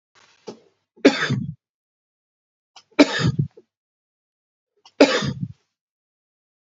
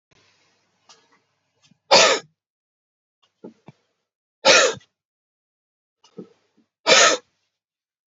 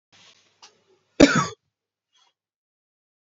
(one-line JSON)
{"three_cough_length": "6.7 s", "three_cough_amplitude": 31968, "three_cough_signal_mean_std_ratio": 0.28, "exhalation_length": "8.1 s", "exhalation_amplitude": 32101, "exhalation_signal_mean_std_ratio": 0.26, "cough_length": "3.3 s", "cough_amplitude": 27427, "cough_signal_mean_std_ratio": 0.19, "survey_phase": "beta (2021-08-13 to 2022-03-07)", "age": "45-64", "gender": "Male", "wearing_mask": "No", "symptom_cough_any": true, "symptom_runny_or_blocked_nose": true, "symptom_fatigue": true, "symptom_headache": true, "symptom_change_to_sense_of_smell_or_taste": true, "smoker_status": "Never smoked", "respiratory_condition_asthma": false, "respiratory_condition_other": false, "recruitment_source": "Test and Trace", "submission_delay": "1 day", "covid_test_result": "Positive", "covid_test_method": "RT-qPCR", "covid_ct_value": 18.4, "covid_ct_gene": "N gene"}